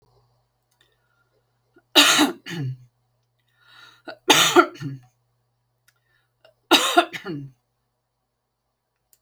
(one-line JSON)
{"three_cough_length": "9.2 s", "three_cough_amplitude": 32767, "three_cough_signal_mean_std_ratio": 0.29, "survey_phase": "beta (2021-08-13 to 2022-03-07)", "age": "65+", "gender": "Female", "wearing_mask": "No", "symptom_none": true, "smoker_status": "Ex-smoker", "respiratory_condition_asthma": false, "respiratory_condition_other": false, "recruitment_source": "REACT", "submission_delay": "1 day", "covid_test_result": "Negative", "covid_test_method": "RT-qPCR"}